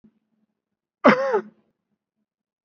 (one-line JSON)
{"cough_length": "2.6 s", "cough_amplitude": 27687, "cough_signal_mean_std_ratio": 0.26, "survey_phase": "beta (2021-08-13 to 2022-03-07)", "age": "18-44", "gender": "Male", "wearing_mask": "Yes", "symptom_none": true, "smoker_status": "Never smoked", "respiratory_condition_asthma": false, "respiratory_condition_other": false, "recruitment_source": "REACT", "submission_delay": "1 day", "covid_test_result": "Negative", "covid_test_method": "RT-qPCR"}